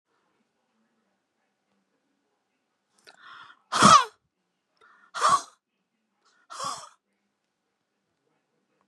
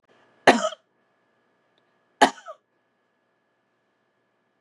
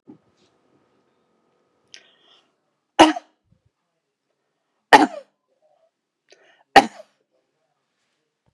{
  "exhalation_length": "8.9 s",
  "exhalation_amplitude": 24104,
  "exhalation_signal_mean_std_ratio": 0.2,
  "cough_length": "4.6 s",
  "cough_amplitude": 29676,
  "cough_signal_mean_std_ratio": 0.17,
  "three_cough_length": "8.5 s",
  "three_cough_amplitude": 32768,
  "three_cough_signal_mean_std_ratio": 0.15,
  "survey_phase": "beta (2021-08-13 to 2022-03-07)",
  "age": "65+",
  "gender": "Female",
  "wearing_mask": "No",
  "symptom_none": true,
  "smoker_status": "Current smoker (1 to 10 cigarettes per day)",
  "respiratory_condition_asthma": false,
  "respiratory_condition_other": false,
  "recruitment_source": "REACT",
  "submission_delay": "2 days",
  "covid_test_result": "Negative",
  "covid_test_method": "RT-qPCR",
  "influenza_a_test_result": "Negative",
  "influenza_b_test_result": "Negative"
}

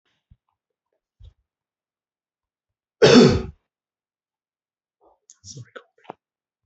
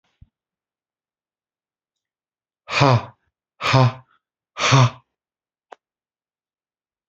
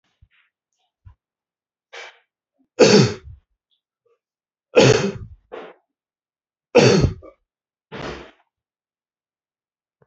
{
  "cough_length": "6.7 s",
  "cough_amplitude": 27939,
  "cough_signal_mean_std_ratio": 0.2,
  "exhalation_length": "7.1 s",
  "exhalation_amplitude": 29086,
  "exhalation_signal_mean_std_ratio": 0.28,
  "three_cough_length": "10.1 s",
  "three_cough_amplitude": 28940,
  "three_cough_signal_mean_std_ratio": 0.27,
  "survey_phase": "alpha (2021-03-01 to 2021-08-12)",
  "age": "45-64",
  "gender": "Male",
  "wearing_mask": "No",
  "symptom_cough_any": true,
  "symptom_fatigue": true,
  "symptom_headache": true,
  "symptom_onset": "3 days",
  "smoker_status": "Never smoked",
  "respiratory_condition_asthma": false,
  "respiratory_condition_other": false,
  "recruitment_source": "Test and Trace",
  "submission_delay": "1 day",
  "covid_test_result": "Positive",
  "covid_test_method": "RT-qPCR",
  "covid_ct_value": 19.7,
  "covid_ct_gene": "ORF1ab gene",
  "covid_ct_mean": 20.8,
  "covid_viral_load": "150000 copies/ml",
  "covid_viral_load_category": "Low viral load (10K-1M copies/ml)"
}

